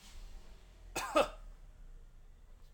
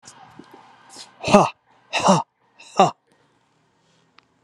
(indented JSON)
{
  "cough_length": "2.7 s",
  "cough_amplitude": 5214,
  "cough_signal_mean_std_ratio": 0.43,
  "exhalation_length": "4.4 s",
  "exhalation_amplitude": 32767,
  "exhalation_signal_mean_std_ratio": 0.29,
  "survey_phase": "alpha (2021-03-01 to 2021-08-12)",
  "age": "45-64",
  "gender": "Male",
  "wearing_mask": "No",
  "symptom_none": true,
  "smoker_status": "Never smoked",
  "respiratory_condition_asthma": false,
  "respiratory_condition_other": false,
  "recruitment_source": "REACT",
  "submission_delay": "2 days",
  "covid_test_result": "Negative",
  "covid_test_method": "RT-qPCR"
}